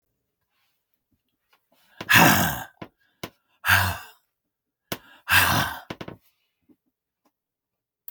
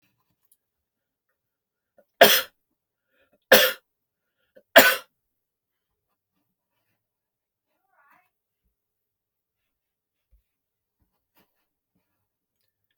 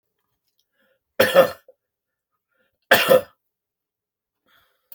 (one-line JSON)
{"exhalation_length": "8.1 s", "exhalation_amplitude": 27521, "exhalation_signal_mean_std_ratio": 0.31, "three_cough_length": "13.0 s", "three_cough_amplitude": 32767, "three_cough_signal_mean_std_ratio": 0.15, "cough_length": "4.9 s", "cough_amplitude": 27932, "cough_signal_mean_std_ratio": 0.25, "survey_phase": "beta (2021-08-13 to 2022-03-07)", "age": "65+", "gender": "Male", "wearing_mask": "No", "symptom_cough_any": true, "symptom_onset": "6 days", "smoker_status": "Ex-smoker", "respiratory_condition_asthma": false, "respiratory_condition_other": false, "recruitment_source": "REACT", "submission_delay": "2 days", "covid_test_result": "Negative", "covid_test_method": "RT-qPCR"}